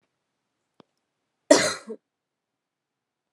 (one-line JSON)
{"cough_length": "3.3 s", "cough_amplitude": 27303, "cough_signal_mean_std_ratio": 0.19, "survey_phase": "beta (2021-08-13 to 2022-03-07)", "age": "18-44", "gender": "Female", "wearing_mask": "No", "symptom_cough_any": true, "symptom_runny_or_blocked_nose": true, "symptom_sore_throat": true, "symptom_headache": true, "symptom_onset": "3 days", "smoker_status": "Ex-smoker", "respiratory_condition_asthma": false, "respiratory_condition_other": false, "recruitment_source": "Test and Trace", "submission_delay": "1 day", "covid_test_result": "Positive", "covid_test_method": "RT-qPCR"}